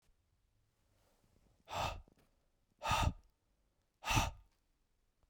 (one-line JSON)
{"exhalation_length": "5.3 s", "exhalation_amplitude": 4121, "exhalation_signal_mean_std_ratio": 0.32, "survey_phase": "beta (2021-08-13 to 2022-03-07)", "age": "18-44", "gender": "Male", "wearing_mask": "No", "symptom_none": true, "smoker_status": "Never smoked", "respiratory_condition_asthma": false, "respiratory_condition_other": false, "recruitment_source": "REACT", "submission_delay": "1 day", "covid_test_result": "Negative", "covid_test_method": "RT-qPCR", "influenza_a_test_result": "Negative", "influenza_b_test_result": "Negative"}